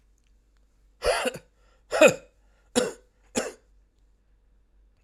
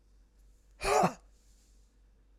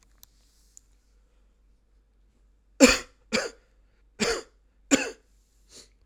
{"cough_length": "5.0 s", "cough_amplitude": 21279, "cough_signal_mean_std_ratio": 0.27, "exhalation_length": "2.4 s", "exhalation_amplitude": 6331, "exhalation_signal_mean_std_ratio": 0.31, "three_cough_length": "6.1 s", "three_cough_amplitude": 32767, "three_cough_signal_mean_std_ratio": 0.23, "survey_phase": "alpha (2021-03-01 to 2021-08-12)", "age": "45-64", "gender": "Male", "wearing_mask": "Yes", "symptom_cough_any": true, "symptom_fatigue": true, "symptom_onset": "6 days", "smoker_status": "Never smoked", "respiratory_condition_asthma": false, "respiratory_condition_other": false, "recruitment_source": "Test and Trace", "submission_delay": "2 days", "covid_test_result": "Positive", "covid_test_method": "RT-qPCR"}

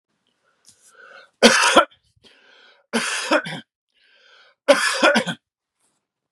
{"three_cough_length": "6.3 s", "three_cough_amplitude": 32767, "three_cough_signal_mean_std_ratio": 0.36, "survey_phase": "beta (2021-08-13 to 2022-03-07)", "age": "45-64", "gender": "Male", "wearing_mask": "No", "symptom_none": true, "smoker_status": "Never smoked", "respiratory_condition_asthma": false, "respiratory_condition_other": false, "recruitment_source": "REACT", "submission_delay": "2 days", "covid_test_result": "Negative", "covid_test_method": "RT-qPCR", "influenza_a_test_result": "Negative", "influenza_b_test_result": "Negative"}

